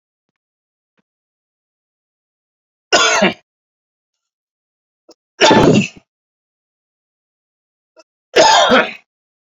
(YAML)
three_cough_length: 9.5 s
three_cough_amplitude: 32767
three_cough_signal_mean_std_ratio: 0.31
survey_phase: beta (2021-08-13 to 2022-03-07)
age: 45-64
gender: Male
wearing_mask: 'No'
symptom_none: true
symptom_onset: 6 days
smoker_status: Ex-smoker
respiratory_condition_asthma: false
respiratory_condition_other: false
recruitment_source: REACT
submission_delay: 1 day
covid_test_result: Negative
covid_test_method: RT-qPCR